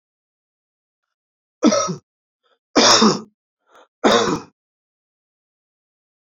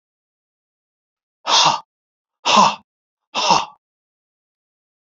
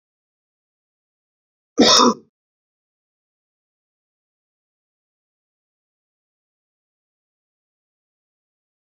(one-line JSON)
{"three_cough_length": "6.2 s", "three_cough_amplitude": 30439, "three_cough_signal_mean_std_ratio": 0.32, "exhalation_length": "5.1 s", "exhalation_amplitude": 29331, "exhalation_signal_mean_std_ratio": 0.32, "cough_length": "9.0 s", "cough_amplitude": 30073, "cough_signal_mean_std_ratio": 0.16, "survey_phase": "beta (2021-08-13 to 2022-03-07)", "age": "45-64", "gender": "Male", "wearing_mask": "No", "symptom_none": true, "smoker_status": "Never smoked", "respiratory_condition_asthma": false, "respiratory_condition_other": false, "recruitment_source": "REACT", "submission_delay": "0 days", "covid_test_result": "Negative", "covid_test_method": "RT-qPCR", "influenza_a_test_result": "Negative", "influenza_b_test_result": "Negative"}